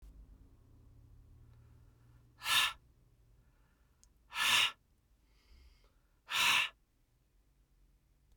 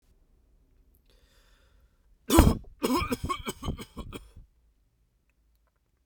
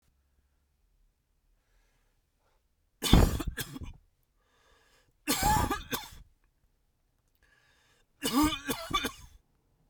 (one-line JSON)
{"exhalation_length": "8.4 s", "exhalation_amplitude": 5219, "exhalation_signal_mean_std_ratio": 0.31, "cough_length": "6.1 s", "cough_amplitude": 27408, "cough_signal_mean_std_ratio": 0.28, "three_cough_length": "9.9 s", "three_cough_amplitude": 20785, "three_cough_signal_mean_std_ratio": 0.31, "survey_phase": "beta (2021-08-13 to 2022-03-07)", "age": "45-64", "gender": "Male", "wearing_mask": "No", "symptom_none": true, "smoker_status": "Never smoked", "respiratory_condition_asthma": false, "respiratory_condition_other": false, "recruitment_source": "REACT", "submission_delay": "2 days", "covid_test_result": "Negative", "covid_test_method": "RT-qPCR"}